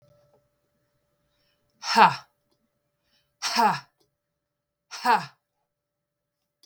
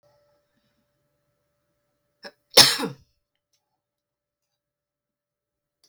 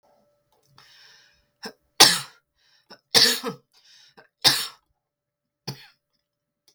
{"exhalation_length": "6.7 s", "exhalation_amplitude": 25418, "exhalation_signal_mean_std_ratio": 0.25, "cough_length": "5.9 s", "cough_amplitude": 32768, "cough_signal_mean_std_ratio": 0.14, "three_cough_length": "6.7 s", "three_cough_amplitude": 32768, "three_cough_signal_mean_std_ratio": 0.24, "survey_phase": "beta (2021-08-13 to 2022-03-07)", "age": "45-64", "gender": "Female", "wearing_mask": "No", "symptom_none": true, "smoker_status": "Ex-smoker", "respiratory_condition_asthma": false, "respiratory_condition_other": false, "recruitment_source": "REACT", "submission_delay": "1 day", "covid_test_result": "Negative", "covid_test_method": "RT-qPCR"}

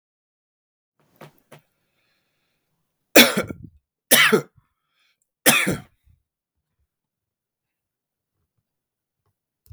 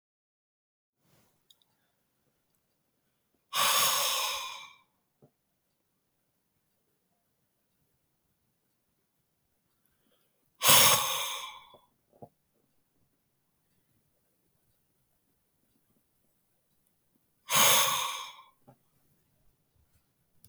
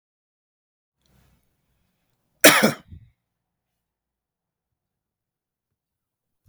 {"three_cough_length": "9.7 s", "three_cough_amplitude": 32768, "three_cough_signal_mean_std_ratio": 0.21, "exhalation_length": "20.5 s", "exhalation_amplitude": 18285, "exhalation_signal_mean_std_ratio": 0.25, "cough_length": "6.5 s", "cough_amplitude": 32493, "cough_signal_mean_std_ratio": 0.15, "survey_phase": "beta (2021-08-13 to 2022-03-07)", "age": "45-64", "gender": "Male", "wearing_mask": "No", "symptom_none": true, "smoker_status": "Ex-smoker", "respiratory_condition_asthma": false, "respiratory_condition_other": false, "recruitment_source": "REACT", "submission_delay": "1 day", "covid_test_result": "Negative", "covid_test_method": "RT-qPCR", "influenza_a_test_result": "Negative", "influenza_b_test_result": "Negative"}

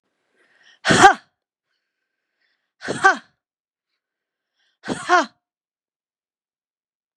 {"exhalation_length": "7.2 s", "exhalation_amplitude": 32768, "exhalation_signal_mean_std_ratio": 0.22, "survey_phase": "beta (2021-08-13 to 2022-03-07)", "age": "65+", "gender": "Female", "wearing_mask": "No", "symptom_none": true, "symptom_onset": "12 days", "smoker_status": "Ex-smoker", "respiratory_condition_asthma": false, "respiratory_condition_other": false, "recruitment_source": "REACT", "submission_delay": "3 days", "covid_test_result": "Negative", "covid_test_method": "RT-qPCR", "influenza_a_test_result": "Negative", "influenza_b_test_result": "Negative"}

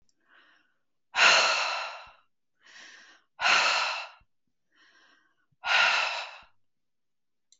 {"exhalation_length": "7.6 s", "exhalation_amplitude": 14917, "exhalation_signal_mean_std_ratio": 0.41, "survey_phase": "beta (2021-08-13 to 2022-03-07)", "age": "45-64", "gender": "Female", "wearing_mask": "No", "symptom_none": true, "smoker_status": "Never smoked", "respiratory_condition_asthma": false, "respiratory_condition_other": false, "recruitment_source": "REACT", "submission_delay": "2 days", "covid_test_result": "Negative", "covid_test_method": "RT-qPCR"}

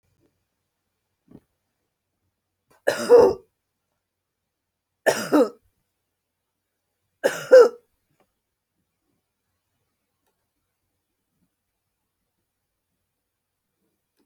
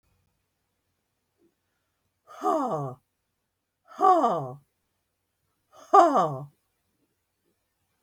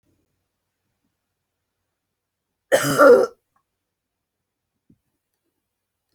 {"three_cough_length": "14.3 s", "three_cough_amplitude": 26201, "three_cough_signal_mean_std_ratio": 0.19, "exhalation_length": "8.0 s", "exhalation_amplitude": 21432, "exhalation_signal_mean_std_ratio": 0.29, "cough_length": "6.1 s", "cough_amplitude": 26577, "cough_signal_mean_std_ratio": 0.21, "survey_phase": "beta (2021-08-13 to 2022-03-07)", "age": "65+", "gender": "Female", "wearing_mask": "No", "symptom_none": true, "symptom_onset": "12 days", "smoker_status": "Never smoked", "respiratory_condition_asthma": false, "respiratory_condition_other": false, "recruitment_source": "REACT", "submission_delay": "1 day", "covid_test_result": "Negative", "covid_test_method": "RT-qPCR"}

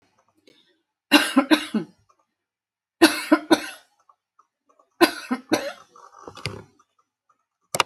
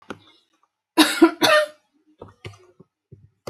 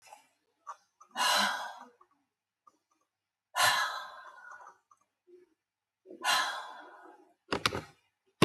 {"three_cough_length": "7.9 s", "three_cough_amplitude": 31277, "three_cough_signal_mean_std_ratio": 0.29, "cough_length": "3.5 s", "cough_amplitude": 28455, "cough_signal_mean_std_ratio": 0.32, "exhalation_length": "8.4 s", "exhalation_amplitude": 32768, "exhalation_signal_mean_std_ratio": 0.32, "survey_phase": "alpha (2021-03-01 to 2021-08-12)", "age": "65+", "gender": "Female", "wearing_mask": "No", "symptom_none": true, "smoker_status": "Never smoked", "respiratory_condition_asthma": false, "respiratory_condition_other": false, "recruitment_source": "REACT", "submission_delay": "1 day", "covid_test_result": "Negative", "covid_test_method": "RT-qPCR"}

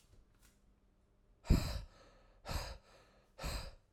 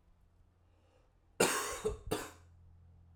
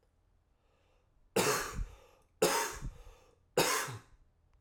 {"exhalation_length": "3.9 s", "exhalation_amplitude": 4540, "exhalation_signal_mean_std_ratio": 0.33, "cough_length": "3.2 s", "cough_amplitude": 6504, "cough_signal_mean_std_ratio": 0.38, "three_cough_length": "4.6 s", "three_cough_amplitude": 6052, "three_cough_signal_mean_std_ratio": 0.43, "survey_phase": "beta (2021-08-13 to 2022-03-07)", "age": "18-44", "gender": "Male", "wearing_mask": "No", "symptom_cough_any": true, "symptom_runny_or_blocked_nose": true, "symptom_sore_throat": true, "symptom_abdominal_pain": true, "symptom_fatigue": true, "symptom_fever_high_temperature": true, "symptom_headache": true, "symptom_onset": "4 days", "smoker_status": "Ex-smoker", "respiratory_condition_asthma": false, "respiratory_condition_other": false, "recruitment_source": "Test and Trace", "submission_delay": "2 days", "covid_test_result": "Positive", "covid_test_method": "RT-qPCR"}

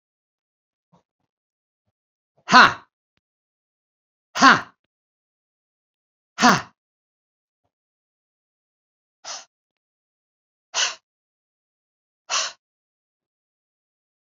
{"exhalation_length": "14.3 s", "exhalation_amplitude": 28296, "exhalation_signal_mean_std_ratio": 0.18, "survey_phase": "beta (2021-08-13 to 2022-03-07)", "age": "45-64", "gender": "Male", "wearing_mask": "No", "symptom_none": true, "smoker_status": "Ex-smoker", "respiratory_condition_asthma": false, "respiratory_condition_other": false, "recruitment_source": "REACT", "submission_delay": "1 day", "covid_test_result": "Negative", "covid_test_method": "RT-qPCR"}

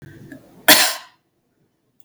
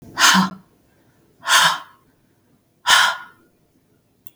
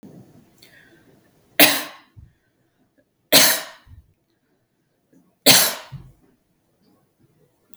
{"cough_length": "2.0 s", "cough_amplitude": 32768, "cough_signal_mean_std_ratio": 0.29, "exhalation_length": "4.4 s", "exhalation_amplitude": 32768, "exhalation_signal_mean_std_ratio": 0.38, "three_cough_length": "7.8 s", "three_cough_amplitude": 32768, "three_cough_signal_mean_std_ratio": 0.25, "survey_phase": "beta (2021-08-13 to 2022-03-07)", "age": "45-64", "gender": "Female", "wearing_mask": "No", "symptom_runny_or_blocked_nose": true, "symptom_sore_throat": true, "symptom_fever_high_temperature": true, "symptom_onset": "4 days", "smoker_status": "Ex-smoker", "respiratory_condition_asthma": false, "respiratory_condition_other": false, "recruitment_source": "Test and Trace", "submission_delay": "2 days", "covid_test_result": "Positive", "covid_test_method": "RT-qPCR", "covid_ct_value": 20.6, "covid_ct_gene": "N gene"}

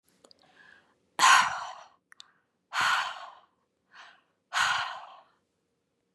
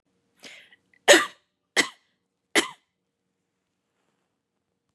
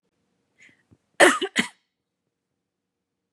{"exhalation_length": "6.1 s", "exhalation_amplitude": 14570, "exhalation_signal_mean_std_ratio": 0.34, "three_cough_length": "4.9 s", "three_cough_amplitude": 29868, "three_cough_signal_mean_std_ratio": 0.19, "cough_length": "3.3 s", "cough_amplitude": 28678, "cough_signal_mean_std_ratio": 0.21, "survey_phase": "beta (2021-08-13 to 2022-03-07)", "age": "18-44", "gender": "Female", "wearing_mask": "No", "symptom_sore_throat": true, "symptom_onset": "13 days", "smoker_status": "Never smoked", "respiratory_condition_asthma": false, "respiratory_condition_other": false, "recruitment_source": "REACT", "submission_delay": "4 days", "covid_test_result": "Negative", "covid_test_method": "RT-qPCR", "influenza_a_test_result": "Negative", "influenza_b_test_result": "Negative"}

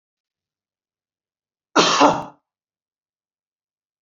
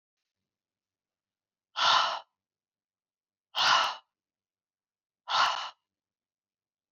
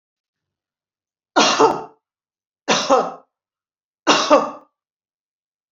{"cough_length": "4.0 s", "cough_amplitude": 32767, "cough_signal_mean_std_ratio": 0.25, "exhalation_length": "6.9 s", "exhalation_amplitude": 9133, "exhalation_signal_mean_std_ratio": 0.31, "three_cough_length": "5.7 s", "three_cough_amplitude": 30740, "three_cough_signal_mean_std_ratio": 0.35, "survey_phase": "beta (2021-08-13 to 2022-03-07)", "age": "65+", "gender": "Female", "wearing_mask": "No", "symptom_none": true, "smoker_status": "Ex-smoker", "respiratory_condition_asthma": false, "respiratory_condition_other": false, "recruitment_source": "REACT", "submission_delay": "2 days", "covid_test_result": "Negative", "covid_test_method": "RT-qPCR"}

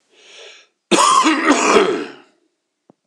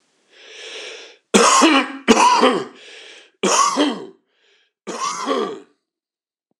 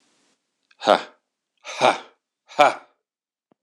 {"cough_length": "3.1 s", "cough_amplitude": 26028, "cough_signal_mean_std_ratio": 0.53, "three_cough_length": "6.6 s", "three_cough_amplitude": 26028, "three_cough_signal_mean_std_ratio": 0.49, "exhalation_length": "3.6 s", "exhalation_amplitude": 26028, "exhalation_signal_mean_std_ratio": 0.26, "survey_phase": "beta (2021-08-13 to 2022-03-07)", "age": "45-64", "gender": "Male", "wearing_mask": "No", "symptom_cough_any": true, "symptom_runny_or_blocked_nose": true, "symptom_sore_throat": true, "symptom_other": true, "smoker_status": "Never smoked", "respiratory_condition_asthma": false, "respiratory_condition_other": false, "recruitment_source": "Test and Trace", "submission_delay": "1 day", "covid_test_result": "Positive", "covid_test_method": "RT-qPCR", "covid_ct_value": 14.8, "covid_ct_gene": "ORF1ab gene", "covid_ct_mean": 15.0, "covid_viral_load": "12000000 copies/ml", "covid_viral_load_category": "High viral load (>1M copies/ml)"}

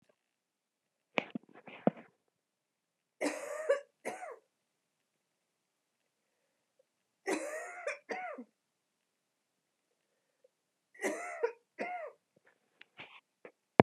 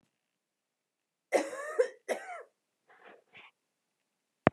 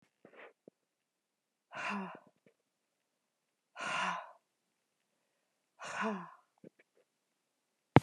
{"three_cough_length": "13.8 s", "three_cough_amplitude": 27093, "three_cough_signal_mean_std_ratio": 0.24, "cough_length": "4.5 s", "cough_amplitude": 23081, "cough_signal_mean_std_ratio": 0.23, "exhalation_length": "8.0 s", "exhalation_amplitude": 22581, "exhalation_signal_mean_std_ratio": 0.21, "survey_phase": "beta (2021-08-13 to 2022-03-07)", "age": "45-64", "gender": "Female", "wearing_mask": "No", "symptom_cough_any": true, "symptom_runny_or_blocked_nose": true, "symptom_shortness_of_breath": true, "symptom_sore_throat": true, "symptom_fatigue": true, "symptom_headache": true, "symptom_change_to_sense_of_smell_or_taste": true, "symptom_loss_of_taste": true, "symptom_onset": "3 days", "smoker_status": "Never smoked", "respiratory_condition_asthma": false, "respiratory_condition_other": false, "recruitment_source": "Test and Trace", "submission_delay": "2 days", "covid_test_result": "Positive", "covid_test_method": "RT-qPCR", "covid_ct_value": 18.2, "covid_ct_gene": "ORF1ab gene", "covid_ct_mean": 18.3, "covid_viral_load": "1000000 copies/ml", "covid_viral_load_category": "High viral load (>1M copies/ml)"}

